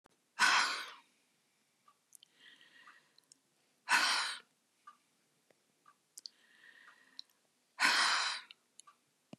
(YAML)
exhalation_length: 9.4 s
exhalation_amplitude: 6050
exhalation_signal_mean_std_ratio: 0.33
survey_phase: beta (2021-08-13 to 2022-03-07)
age: 65+
gender: Female
wearing_mask: 'No'
symptom_none: true
smoker_status: Ex-smoker
respiratory_condition_asthma: false
respiratory_condition_other: false
recruitment_source: REACT
submission_delay: 5 days
covid_test_result: Negative
covid_test_method: RT-qPCR
influenza_a_test_result: Negative
influenza_b_test_result: Negative